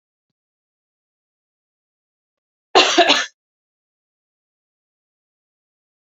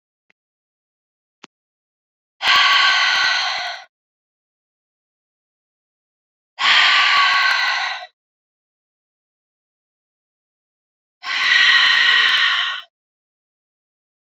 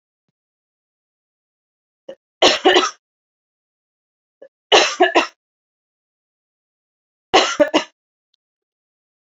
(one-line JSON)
{"cough_length": "6.1 s", "cough_amplitude": 30987, "cough_signal_mean_std_ratio": 0.21, "exhalation_length": "14.3 s", "exhalation_amplitude": 27125, "exhalation_signal_mean_std_ratio": 0.45, "three_cough_length": "9.2 s", "three_cough_amplitude": 30793, "three_cough_signal_mean_std_ratio": 0.27, "survey_phase": "beta (2021-08-13 to 2022-03-07)", "age": "18-44", "gender": "Female", "wearing_mask": "No", "symptom_cough_any": true, "symptom_fatigue": true, "symptom_change_to_sense_of_smell_or_taste": true, "symptom_onset": "5 days", "smoker_status": "Ex-smoker", "respiratory_condition_asthma": false, "respiratory_condition_other": false, "recruitment_source": "Test and Trace", "submission_delay": "2 days", "covid_test_result": "Positive", "covid_test_method": "RT-qPCR"}